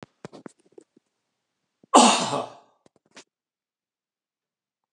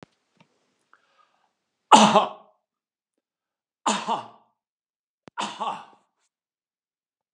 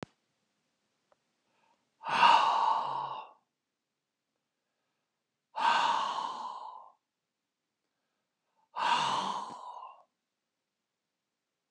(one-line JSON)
{"cough_length": "4.9 s", "cough_amplitude": 31075, "cough_signal_mean_std_ratio": 0.22, "three_cough_length": "7.3 s", "three_cough_amplitude": 32471, "three_cough_signal_mean_std_ratio": 0.22, "exhalation_length": "11.7 s", "exhalation_amplitude": 10663, "exhalation_signal_mean_std_ratio": 0.38, "survey_phase": "beta (2021-08-13 to 2022-03-07)", "age": "65+", "gender": "Male", "wearing_mask": "No", "symptom_none": true, "smoker_status": "Never smoked", "respiratory_condition_asthma": false, "respiratory_condition_other": false, "recruitment_source": "REACT", "submission_delay": "3 days", "covid_test_result": "Negative", "covid_test_method": "RT-qPCR", "influenza_a_test_result": "Negative", "influenza_b_test_result": "Negative"}